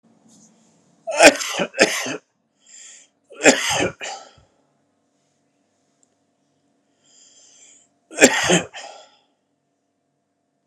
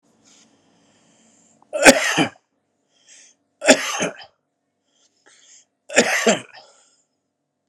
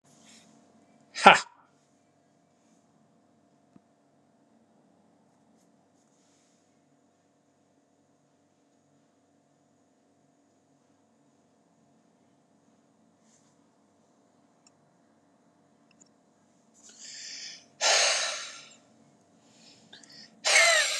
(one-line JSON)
{"cough_length": "10.7 s", "cough_amplitude": 32768, "cough_signal_mean_std_ratio": 0.28, "three_cough_length": "7.7 s", "three_cough_amplitude": 32768, "three_cough_signal_mean_std_ratio": 0.28, "exhalation_length": "21.0 s", "exhalation_amplitude": 32767, "exhalation_signal_mean_std_ratio": 0.19, "survey_phase": "alpha (2021-03-01 to 2021-08-12)", "age": "45-64", "gender": "Male", "wearing_mask": "No", "symptom_none": true, "smoker_status": "Never smoked", "respiratory_condition_asthma": true, "respiratory_condition_other": false, "recruitment_source": "REACT", "submission_delay": "1 day", "covid_test_result": "Negative", "covid_test_method": "RT-qPCR"}